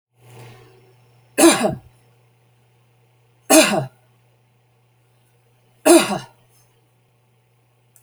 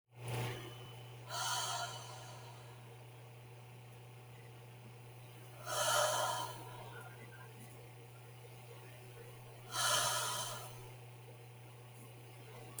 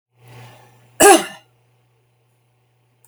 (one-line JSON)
{"three_cough_length": "8.0 s", "three_cough_amplitude": 32768, "three_cough_signal_mean_std_ratio": 0.27, "exhalation_length": "12.8 s", "exhalation_amplitude": 2897, "exhalation_signal_mean_std_ratio": 0.64, "cough_length": "3.1 s", "cough_amplitude": 32768, "cough_signal_mean_std_ratio": 0.23, "survey_phase": "beta (2021-08-13 to 2022-03-07)", "age": "65+", "gender": "Female", "wearing_mask": "No", "symptom_none": true, "smoker_status": "Never smoked", "respiratory_condition_asthma": false, "respiratory_condition_other": false, "recruitment_source": "REACT", "submission_delay": "1 day", "covid_test_result": "Negative", "covid_test_method": "RT-qPCR"}